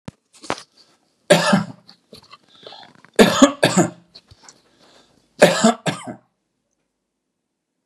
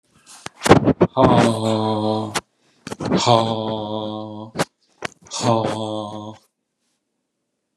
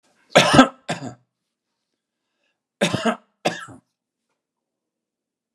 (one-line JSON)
{"three_cough_length": "7.9 s", "three_cough_amplitude": 32768, "three_cough_signal_mean_std_ratio": 0.31, "exhalation_length": "7.8 s", "exhalation_amplitude": 32768, "exhalation_signal_mean_std_ratio": 0.49, "cough_length": "5.5 s", "cough_amplitude": 32767, "cough_signal_mean_std_ratio": 0.26, "survey_phase": "beta (2021-08-13 to 2022-03-07)", "age": "65+", "gender": "Male", "wearing_mask": "No", "symptom_none": true, "smoker_status": "Never smoked", "respiratory_condition_asthma": false, "respiratory_condition_other": false, "recruitment_source": "REACT", "submission_delay": "2 days", "covid_test_result": "Negative", "covid_test_method": "RT-qPCR", "influenza_a_test_result": "Negative", "influenza_b_test_result": "Negative"}